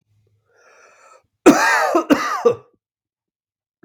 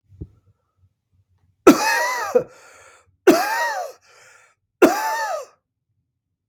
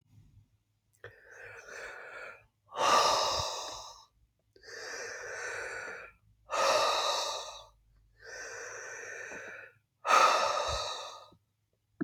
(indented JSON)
{
  "cough_length": "3.8 s",
  "cough_amplitude": 32768,
  "cough_signal_mean_std_ratio": 0.37,
  "three_cough_length": "6.5 s",
  "three_cough_amplitude": 32768,
  "three_cough_signal_mean_std_ratio": 0.37,
  "exhalation_length": "12.0 s",
  "exhalation_amplitude": 9052,
  "exhalation_signal_mean_std_ratio": 0.49,
  "survey_phase": "beta (2021-08-13 to 2022-03-07)",
  "age": "45-64",
  "gender": "Male",
  "wearing_mask": "No",
  "symptom_runny_or_blocked_nose": true,
  "symptom_shortness_of_breath": true,
  "symptom_fatigue": true,
  "symptom_other": true,
  "symptom_onset": "5 days",
  "smoker_status": "Never smoked",
  "respiratory_condition_asthma": false,
  "respiratory_condition_other": false,
  "recruitment_source": "Test and Trace",
  "submission_delay": "2 days",
  "covid_test_result": "Positive",
  "covid_test_method": "ePCR"
}